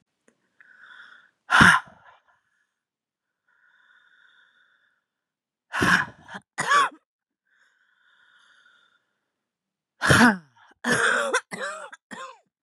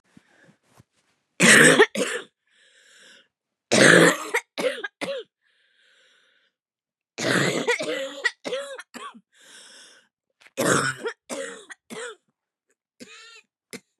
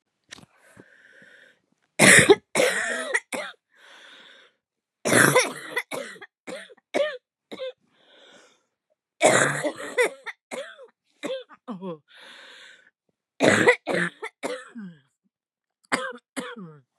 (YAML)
exhalation_length: 12.6 s
exhalation_amplitude: 28394
exhalation_signal_mean_std_ratio: 0.3
three_cough_length: 14.0 s
three_cough_amplitude: 31717
three_cough_signal_mean_std_ratio: 0.35
cough_length: 17.0 s
cough_amplitude: 31784
cough_signal_mean_std_ratio: 0.35
survey_phase: beta (2021-08-13 to 2022-03-07)
age: 45-64
gender: Female
wearing_mask: 'No'
symptom_cough_any: true
symptom_new_continuous_cough: true
symptom_runny_or_blocked_nose: true
symptom_shortness_of_breath: true
symptom_sore_throat: true
symptom_diarrhoea: true
symptom_fatigue: true
symptom_fever_high_temperature: true
symptom_headache: true
symptom_onset: 3 days
smoker_status: Ex-smoker
respiratory_condition_asthma: false
respiratory_condition_other: false
recruitment_source: Test and Trace
submission_delay: 1 day
covid_test_result: Positive
covid_test_method: ePCR